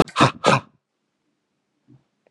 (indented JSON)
{
  "exhalation_length": "2.3 s",
  "exhalation_amplitude": 28737,
  "exhalation_signal_mean_std_ratio": 0.28,
  "survey_phase": "beta (2021-08-13 to 2022-03-07)",
  "age": "45-64",
  "gender": "Male",
  "wearing_mask": "No",
  "symptom_fatigue": true,
  "symptom_headache": true,
  "smoker_status": "Current smoker (11 or more cigarettes per day)",
  "respiratory_condition_asthma": false,
  "respiratory_condition_other": false,
  "recruitment_source": "Test and Trace",
  "submission_delay": "1 day",
  "covid_test_result": "Positive",
  "covid_test_method": "RT-qPCR",
  "covid_ct_value": 34.7,
  "covid_ct_gene": "N gene"
}